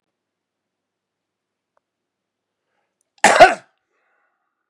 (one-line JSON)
{"cough_length": "4.7 s", "cough_amplitude": 32768, "cough_signal_mean_std_ratio": 0.18, "survey_phase": "beta (2021-08-13 to 2022-03-07)", "age": "45-64", "gender": "Male", "wearing_mask": "No", "symptom_cough_any": true, "symptom_runny_or_blocked_nose": true, "symptom_sore_throat": true, "symptom_fatigue": true, "symptom_fever_high_temperature": true, "symptom_onset": "6 days", "smoker_status": "Current smoker (1 to 10 cigarettes per day)", "respiratory_condition_asthma": false, "respiratory_condition_other": false, "recruitment_source": "Test and Trace", "submission_delay": "2 days", "covid_test_result": "Positive", "covid_test_method": "RT-qPCR", "covid_ct_value": 23.4, "covid_ct_gene": "ORF1ab gene", "covid_ct_mean": 24.1, "covid_viral_load": "12000 copies/ml", "covid_viral_load_category": "Low viral load (10K-1M copies/ml)"}